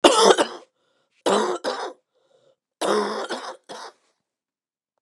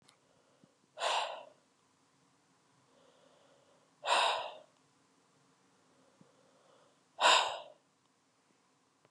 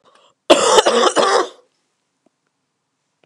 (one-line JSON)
{"three_cough_length": "5.0 s", "three_cough_amplitude": 32399, "three_cough_signal_mean_std_ratio": 0.39, "exhalation_length": "9.1 s", "exhalation_amplitude": 7692, "exhalation_signal_mean_std_ratio": 0.28, "cough_length": "3.3 s", "cough_amplitude": 32768, "cough_signal_mean_std_ratio": 0.42, "survey_phase": "beta (2021-08-13 to 2022-03-07)", "age": "18-44", "gender": "Female", "wearing_mask": "No", "symptom_new_continuous_cough": true, "symptom_runny_or_blocked_nose": true, "symptom_sore_throat": true, "symptom_fatigue": true, "symptom_headache": true, "symptom_change_to_sense_of_smell_or_taste": true, "symptom_loss_of_taste": true, "smoker_status": "Ex-smoker", "respiratory_condition_asthma": true, "respiratory_condition_other": false, "recruitment_source": "Test and Trace", "submission_delay": "2 days", "covid_test_result": "Positive", "covid_test_method": "RT-qPCR", "covid_ct_value": 30.2, "covid_ct_gene": "ORF1ab gene"}